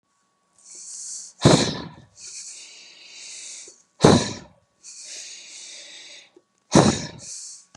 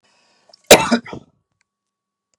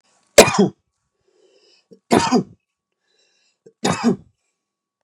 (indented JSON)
{
  "exhalation_length": "7.8 s",
  "exhalation_amplitude": 32767,
  "exhalation_signal_mean_std_ratio": 0.32,
  "cough_length": "2.4 s",
  "cough_amplitude": 32768,
  "cough_signal_mean_std_ratio": 0.22,
  "three_cough_length": "5.0 s",
  "three_cough_amplitude": 32768,
  "three_cough_signal_mean_std_ratio": 0.29,
  "survey_phase": "beta (2021-08-13 to 2022-03-07)",
  "age": "18-44",
  "gender": "Male",
  "wearing_mask": "No",
  "symptom_none": true,
  "smoker_status": "Ex-smoker",
  "respiratory_condition_asthma": false,
  "respiratory_condition_other": false,
  "recruitment_source": "REACT",
  "submission_delay": "1 day",
  "covid_test_result": "Negative",
  "covid_test_method": "RT-qPCR",
  "influenza_a_test_result": "Negative",
  "influenza_b_test_result": "Negative"
}